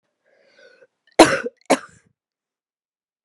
{"cough_length": "3.2 s", "cough_amplitude": 32768, "cough_signal_mean_std_ratio": 0.2, "survey_phase": "beta (2021-08-13 to 2022-03-07)", "age": "18-44", "gender": "Female", "wearing_mask": "No", "symptom_cough_any": true, "symptom_new_continuous_cough": true, "symptom_runny_or_blocked_nose": true, "symptom_fever_high_temperature": true, "smoker_status": "Current smoker (1 to 10 cigarettes per day)", "respiratory_condition_asthma": false, "respiratory_condition_other": false, "recruitment_source": "Test and Trace", "submission_delay": "1 day", "covid_test_result": "Positive", "covid_test_method": "RT-qPCR", "covid_ct_value": 14.8, "covid_ct_gene": "ORF1ab gene", "covid_ct_mean": 15.3, "covid_viral_load": "9600000 copies/ml", "covid_viral_load_category": "High viral load (>1M copies/ml)"}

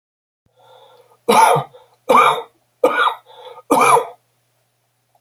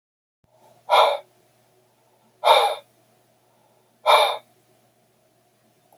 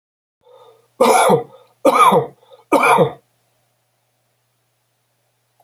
{"cough_length": "5.2 s", "cough_amplitude": 32767, "cough_signal_mean_std_ratio": 0.42, "exhalation_length": "6.0 s", "exhalation_amplitude": 24993, "exhalation_signal_mean_std_ratio": 0.31, "three_cough_length": "5.6 s", "three_cough_amplitude": 31479, "three_cough_signal_mean_std_ratio": 0.39, "survey_phase": "alpha (2021-03-01 to 2021-08-12)", "age": "65+", "gender": "Male", "wearing_mask": "No", "symptom_none": true, "smoker_status": "Never smoked", "respiratory_condition_asthma": false, "respiratory_condition_other": false, "recruitment_source": "REACT", "submission_delay": "2 days", "covid_test_result": "Negative", "covid_test_method": "RT-qPCR"}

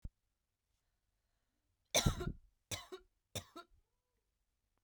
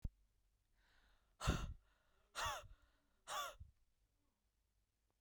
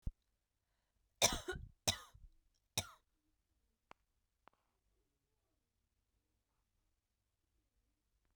{"three_cough_length": "4.8 s", "three_cough_amplitude": 4296, "three_cough_signal_mean_std_ratio": 0.24, "exhalation_length": "5.2 s", "exhalation_amplitude": 1518, "exhalation_signal_mean_std_ratio": 0.34, "cough_length": "8.4 s", "cough_amplitude": 5160, "cough_signal_mean_std_ratio": 0.17, "survey_phase": "beta (2021-08-13 to 2022-03-07)", "age": "18-44", "gender": "Female", "wearing_mask": "No", "symptom_runny_or_blocked_nose": true, "symptom_sore_throat": true, "smoker_status": "Never smoked", "respiratory_condition_asthma": false, "respiratory_condition_other": false, "recruitment_source": "Test and Trace", "submission_delay": "2 days", "covid_test_result": "Positive", "covid_test_method": "RT-qPCR", "covid_ct_value": 22.8, "covid_ct_gene": "ORF1ab gene", "covid_ct_mean": 23.3, "covid_viral_load": "23000 copies/ml", "covid_viral_load_category": "Low viral load (10K-1M copies/ml)"}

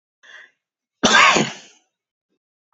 {"cough_length": "2.7 s", "cough_amplitude": 30988, "cough_signal_mean_std_ratio": 0.33, "survey_phase": "beta (2021-08-13 to 2022-03-07)", "age": "65+", "gender": "Female", "wearing_mask": "No", "symptom_runny_or_blocked_nose": true, "symptom_fatigue": true, "symptom_headache": true, "symptom_onset": "6 days", "smoker_status": "Current smoker (e-cigarettes or vapes only)", "respiratory_condition_asthma": false, "respiratory_condition_other": false, "recruitment_source": "Test and Trace", "submission_delay": "2 days", "covid_test_result": "Positive", "covid_test_method": "RT-qPCR", "covid_ct_value": 21.3, "covid_ct_gene": "ORF1ab gene", "covid_ct_mean": 21.9, "covid_viral_load": "64000 copies/ml", "covid_viral_load_category": "Low viral load (10K-1M copies/ml)"}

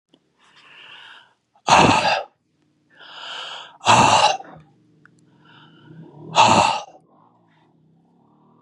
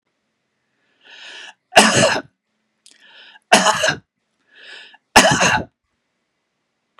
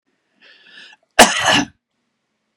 {"exhalation_length": "8.6 s", "exhalation_amplitude": 31663, "exhalation_signal_mean_std_ratio": 0.36, "three_cough_length": "7.0 s", "three_cough_amplitude": 32768, "three_cough_signal_mean_std_ratio": 0.34, "cough_length": "2.6 s", "cough_amplitude": 32768, "cough_signal_mean_std_ratio": 0.3, "survey_phase": "beta (2021-08-13 to 2022-03-07)", "age": "45-64", "gender": "Male", "wearing_mask": "No", "symptom_none": true, "smoker_status": "Ex-smoker", "respiratory_condition_asthma": false, "respiratory_condition_other": false, "recruitment_source": "REACT", "submission_delay": "2 days", "covid_test_result": "Negative", "covid_test_method": "RT-qPCR", "influenza_a_test_result": "Negative", "influenza_b_test_result": "Negative"}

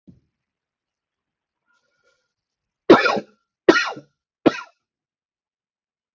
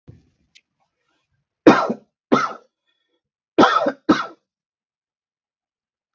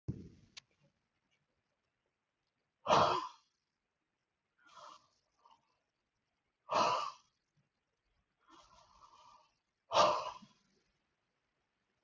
{"three_cough_length": "6.1 s", "three_cough_amplitude": 32767, "three_cough_signal_mean_std_ratio": 0.2, "cough_length": "6.1 s", "cough_amplitude": 32767, "cough_signal_mean_std_ratio": 0.27, "exhalation_length": "12.0 s", "exhalation_amplitude": 5555, "exhalation_signal_mean_std_ratio": 0.25, "survey_phase": "beta (2021-08-13 to 2022-03-07)", "age": "18-44", "gender": "Male", "wearing_mask": "No", "symptom_none": true, "smoker_status": "Ex-smoker", "respiratory_condition_asthma": false, "respiratory_condition_other": false, "recruitment_source": "REACT", "submission_delay": "6 days", "covid_test_result": "Negative", "covid_test_method": "RT-qPCR", "influenza_a_test_result": "Unknown/Void", "influenza_b_test_result": "Unknown/Void"}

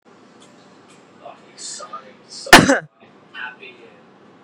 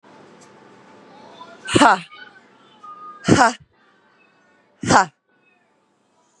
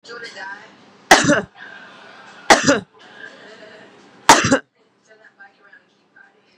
{"cough_length": "4.4 s", "cough_amplitude": 32768, "cough_signal_mean_std_ratio": 0.23, "exhalation_length": "6.4 s", "exhalation_amplitude": 32767, "exhalation_signal_mean_std_ratio": 0.28, "three_cough_length": "6.6 s", "three_cough_amplitude": 32768, "three_cough_signal_mean_std_ratio": 0.3, "survey_phase": "beta (2021-08-13 to 2022-03-07)", "age": "45-64", "gender": "Female", "wearing_mask": "No", "symptom_none": true, "smoker_status": "Current smoker (11 or more cigarettes per day)", "respiratory_condition_asthma": false, "respiratory_condition_other": false, "recruitment_source": "REACT", "submission_delay": "3 days", "covid_test_result": "Negative", "covid_test_method": "RT-qPCR", "influenza_a_test_result": "Negative", "influenza_b_test_result": "Negative"}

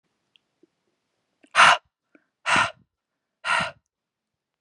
{"exhalation_length": "4.6 s", "exhalation_amplitude": 28278, "exhalation_signal_mean_std_ratio": 0.27, "survey_phase": "beta (2021-08-13 to 2022-03-07)", "age": "18-44", "gender": "Female", "wearing_mask": "No", "symptom_none": true, "smoker_status": "Never smoked", "respiratory_condition_asthma": false, "respiratory_condition_other": false, "recruitment_source": "REACT", "submission_delay": "0 days", "covid_test_result": "Negative", "covid_test_method": "RT-qPCR"}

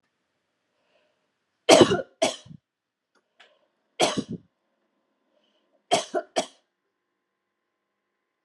{"three_cough_length": "8.4 s", "three_cough_amplitude": 28131, "three_cough_signal_mean_std_ratio": 0.22, "survey_phase": "beta (2021-08-13 to 2022-03-07)", "age": "65+", "gender": "Female", "wearing_mask": "No", "symptom_none": true, "smoker_status": "Ex-smoker", "respiratory_condition_asthma": false, "respiratory_condition_other": false, "recruitment_source": "REACT", "submission_delay": "3 days", "covid_test_result": "Negative", "covid_test_method": "RT-qPCR"}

